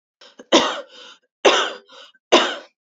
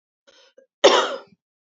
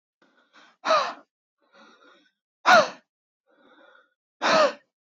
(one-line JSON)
{"three_cough_length": "3.0 s", "three_cough_amplitude": 29984, "three_cough_signal_mean_std_ratio": 0.38, "cough_length": "1.7 s", "cough_amplitude": 28385, "cough_signal_mean_std_ratio": 0.3, "exhalation_length": "5.1 s", "exhalation_amplitude": 21379, "exhalation_signal_mean_std_ratio": 0.3, "survey_phase": "beta (2021-08-13 to 2022-03-07)", "age": "18-44", "gender": "Female", "wearing_mask": "No", "symptom_none": true, "smoker_status": "Ex-smoker", "respiratory_condition_asthma": false, "respiratory_condition_other": false, "recruitment_source": "REACT", "submission_delay": "1 day", "covid_test_result": "Negative", "covid_test_method": "RT-qPCR", "influenza_a_test_result": "Negative", "influenza_b_test_result": "Negative"}